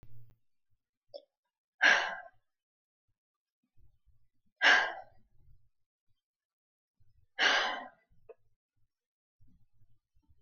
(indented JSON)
{
  "exhalation_length": "10.4 s",
  "exhalation_amplitude": 9830,
  "exhalation_signal_mean_std_ratio": 0.26,
  "survey_phase": "beta (2021-08-13 to 2022-03-07)",
  "age": "45-64",
  "gender": "Female",
  "wearing_mask": "No",
  "symptom_none": true,
  "smoker_status": "Never smoked",
  "respiratory_condition_asthma": false,
  "respiratory_condition_other": false,
  "recruitment_source": "REACT",
  "submission_delay": "2 days",
  "covid_test_result": "Negative",
  "covid_test_method": "RT-qPCR"
}